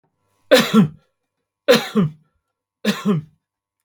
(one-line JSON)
{"three_cough_length": "3.8 s", "three_cough_amplitude": 32767, "three_cough_signal_mean_std_ratio": 0.39, "survey_phase": "beta (2021-08-13 to 2022-03-07)", "age": "65+", "gender": "Male", "wearing_mask": "No", "symptom_none": true, "smoker_status": "Ex-smoker", "respiratory_condition_asthma": false, "respiratory_condition_other": false, "recruitment_source": "REACT", "submission_delay": "2 days", "covid_test_result": "Negative", "covid_test_method": "RT-qPCR", "influenza_a_test_result": "Negative", "influenza_b_test_result": "Negative"}